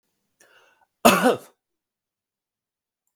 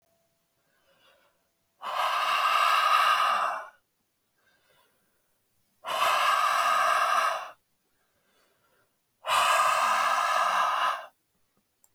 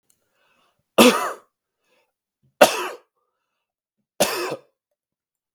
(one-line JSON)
{"cough_length": "3.2 s", "cough_amplitude": 32766, "cough_signal_mean_std_ratio": 0.23, "exhalation_length": "11.9 s", "exhalation_amplitude": 8834, "exhalation_signal_mean_std_ratio": 0.6, "three_cough_length": "5.5 s", "three_cough_amplitude": 32768, "three_cough_signal_mean_std_ratio": 0.25, "survey_phase": "beta (2021-08-13 to 2022-03-07)", "age": "18-44", "gender": "Male", "wearing_mask": "No", "symptom_none": true, "smoker_status": "Ex-smoker", "respiratory_condition_asthma": false, "respiratory_condition_other": false, "recruitment_source": "REACT", "submission_delay": "2 days", "covid_test_result": "Negative", "covid_test_method": "RT-qPCR", "influenza_a_test_result": "Negative", "influenza_b_test_result": "Negative"}